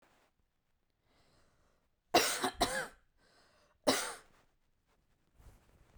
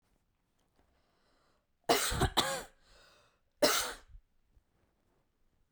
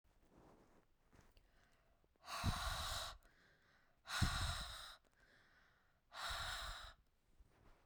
{"cough_length": "6.0 s", "cough_amplitude": 7939, "cough_signal_mean_std_ratio": 0.28, "three_cough_length": "5.7 s", "three_cough_amplitude": 9545, "three_cough_signal_mean_std_ratio": 0.31, "exhalation_length": "7.9 s", "exhalation_amplitude": 2018, "exhalation_signal_mean_std_ratio": 0.47, "survey_phase": "beta (2021-08-13 to 2022-03-07)", "age": "18-44", "gender": "Female", "wearing_mask": "No", "symptom_none": true, "smoker_status": "Current smoker (1 to 10 cigarettes per day)", "respiratory_condition_asthma": false, "respiratory_condition_other": false, "recruitment_source": "REACT", "submission_delay": "2 days", "covid_test_result": "Negative", "covid_test_method": "RT-qPCR"}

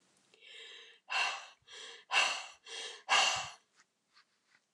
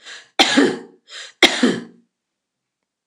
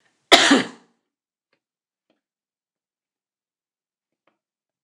{"exhalation_length": "4.7 s", "exhalation_amplitude": 5959, "exhalation_signal_mean_std_ratio": 0.41, "three_cough_length": "3.1 s", "three_cough_amplitude": 29204, "three_cough_signal_mean_std_ratio": 0.38, "cough_length": "4.8 s", "cough_amplitude": 29204, "cough_signal_mean_std_ratio": 0.19, "survey_phase": "beta (2021-08-13 to 2022-03-07)", "age": "65+", "gender": "Female", "wearing_mask": "No", "symptom_none": true, "symptom_onset": "12 days", "smoker_status": "Never smoked", "respiratory_condition_asthma": false, "respiratory_condition_other": false, "recruitment_source": "REACT", "submission_delay": "2 days", "covid_test_result": "Negative", "covid_test_method": "RT-qPCR"}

